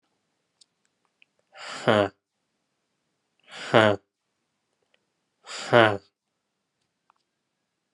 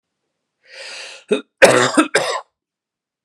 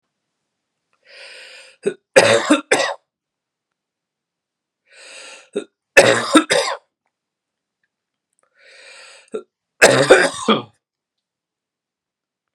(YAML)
exhalation_length: 7.9 s
exhalation_amplitude: 29667
exhalation_signal_mean_std_ratio: 0.22
cough_length: 3.2 s
cough_amplitude: 32768
cough_signal_mean_std_ratio: 0.36
three_cough_length: 12.5 s
three_cough_amplitude: 32768
three_cough_signal_mean_std_ratio: 0.3
survey_phase: beta (2021-08-13 to 2022-03-07)
age: 18-44
gender: Male
wearing_mask: 'No'
symptom_cough_any: true
symptom_runny_or_blocked_nose: true
symptom_headache: true
symptom_change_to_sense_of_smell_or_taste: true
symptom_loss_of_taste: true
symptom_onset: 6 days
smoker_status: Never smoked
respiratory_condition_asthma: false
respiratory_condition_other: false
recruitment_source: Test and Trace
submission_delay: 2 days
covid_test_result: Positive
covid_test_method: RT-qPCR
covid_ct_value: 18.1
covid_ct_gene: ORF1ab gene